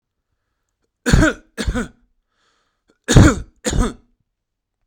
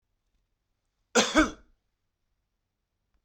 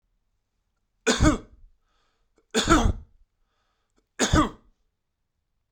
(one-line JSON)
{"exhalation_length": "4.9 s", "exhalation_amplitude": 32768, "exhalation_signal_mean_std_ratio": 0.32, "cough_length": "3.2 s", "cough_amplitude": 14194, "cough_signal_mean_std_ratio": 0.23, "three_cough_length": "5.7 s", "three_cough_amplitude": 17641, "three_cough_signal_mean_std_ratio": 0.32, "survey_phase": "beta (2021-08-13 to 2022-03-07)", "age": "45-64", "gender": "Male", "wearing_mask": "No", "symptom_none": true, "smoker_status": "Current smoker (e-cigarettes or vapes only)", "respiratory_condition_asthma": true, "respiratory_condition_other": false, "recruitment_source": "REACT", "submission_delay": "2 days", "covid_test_result": "Negative", "covid_test_method": "RT-qPCR", "influenza_a_test_result": "Negative", "influenza_b_test_result": "Negative"}